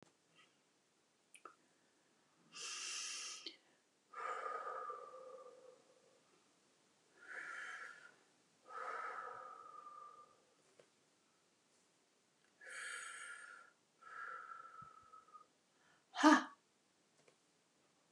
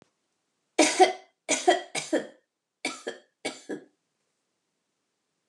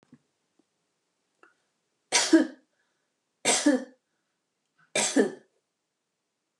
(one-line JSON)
{"exhalation_length": "18.1 s", "exhalation_amplitude": 5695, "exhalation_signal_mean_std_ratio": 0.3, "cough_length": "5.5 s", "cough_amplitude": 19156, "cough_signal_mean_std_ratio": 0.3, "three_cough_length": "6.6 s", "three_cough_amplitude": 12674, "three_cough_signal_mean_std_ratio": 0.29, "survey_phase": "alpha (2021-03-01 to 2021-08-12)", "age": "65+", "gender": "Female", "wearing_mask": "No", "symptom_none": true, "smoker_status": "Never smoked", "respiratory_condition_asthma": false, "respiratory_condition_other": false, "recruitment_source": "REACT", "submission_delay": "6 days", "covid_test_result": "Negative", "covid_test_method": "RT-qPCR"}